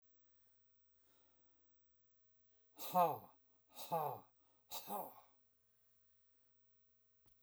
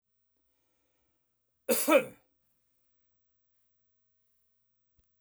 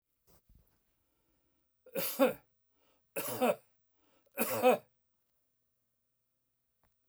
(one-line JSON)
{"exhalation_length": "7.4 s", "exhalation_amplitude": 2909, "exhalation_signal_mean_std_ratio": 0.3, "cough_length": "5.2 s", "cough_amplitude": 9947, "cough_signal_mean_std_ratio": 0.2, "three_cough_length": "7.1 s", "three_cough_amplitude": 5688, "three_cough_signal_mean_std_ratio": 0.29, "survey_phase": "beta (2021-08-13 to 2022-03-07)", "age": "65+", "gender": "Male", "wearing_mask": "No", "symptom_none": true, "smoker_status": "Never smoked", "respiratory_condition_asthma": false, "respiratory_condition_other": false, "recruitment_source": "REACT", "submission_delay": "1 day", "covid_test_result": "Negative", "covid_test_method": "RT-qPCR"}